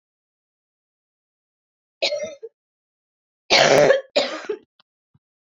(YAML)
three_cough_length: 5.5 s
three_cough_amplitude: 25920
three_cough_signal_mean_std_ratio: 0.32
survey_phase: beta (2021-08-13 to 2022-03-07)
age: 18-44
gender: Female
wearing_mask: 'No'
symptom_cough_any: true
symptom_runny_or_blocked_nose: true
symptom_shortness_of_breath: true
symptom_fatigue: true
symptom_headache: true
smoker_status: Never smoked
respiratory_condition_asthma: true
respiratory_condition_other: false
recruitment_source: Test and Trace
submission_delay: 1 day
covid_test_result: Positive
covid_test_method: LFT